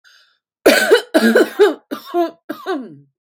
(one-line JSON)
{"three_cough_length": "3.3 s", "three_cough_amplitude": 32768, "three_cough_signal_mean_std_ratio": 0.5, "survey_phase": "beta (2021-08-13 to 2022-03-07)", "age": "18-44", "gender": "Female", "wearing_mask": "No", "symptom_runny_or_blocked_nose": true, "smoker_status": "Current smoker (1 to 10 cigarettes per day)", "respiratory_condition_asthma": false, "respiratory_condition_other": false, "recruitment_source": "REACT", "submission_delay": "1 day", "covid_test_result": "Negative", "covid_test_method": "RT-qPCR"}